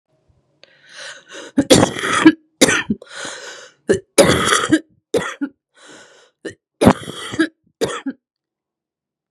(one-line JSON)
{"three_cough_length": "9.3 s", "three_cough_amplitude": 32768, "three_cough_signal_mean_std_ratio": 0.38, "survey_phase": "beta (2021-08-13 to 2022-03-07)", "age": "18-44", "gender": "Female", "wearing_mask": "No", "symptom_none": true, "smoker_status": "Current smoker (1 to 10 cigarettes per day)", "respiratory_condition_asthma": true, "respiratory_condition_other": false, "recruitment_source": "Test and Trace", "submission_delay": "2 days", "covid_test_result": "Negative", "covid_test_method": "RT-qPCR"}